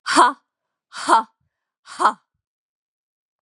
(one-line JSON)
{"exhalation_length": "3.4 s", "exhalation_amplitude": 30165, "exhalation_signal_mean_std_ratio": 0.32, "survey_phase": "beta (2021-08-13 to 2022-03-07)", "age": "18-44", "gender": "Female", "wearing_mask": "No", "symptom_cough_any": true, "symptom_runny_or_blocked_nose": true, "symptom_sore_throat": true, "smoker_status": "Ex-smoker", "respiratory_condition_asthma": false, "respiratory_condition_other": false, "recruitment_source": "Test and Trace", "submission_delay": "2 days", "covid_test_result": "Positive", "covid_test_method": "RT-qPCR"}